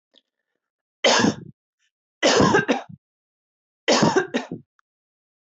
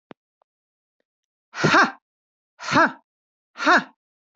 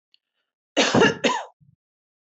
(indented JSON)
{
  "three_cough_length": "5.5 s",
  "three_cough_amplitude": 20555,
  "three_cough_signal_mean_std_ratio": 0.4,
  "exhalation_length": "4.4 s",
  "exhalation_amplitude": 22238,
  "exhalation_signal_mean_std_ratio": 0.32,
  "cough_length": "2.2 s",
  "cough_amplitude": 18737,
  "cough_signal_mean_std_ratio": 0.39,
  "survey_phase": "beta (2021-08-13 to 2022-03-07)",
  "age": "18-44",
  "gender": "Female",
  "wearing_mask": "No",
  "symptom_none": true,
  "smoker_status": "Never smoked",
  "respiratory_condition_asthma": false,
  "respiratory_condition_other": false,
  "recruitment_source": "Test and Trace",
  "submission_delay": "1 day",
  "covid_test_result": "Negative",
  "covid_test_method": "RT-qPCR"
}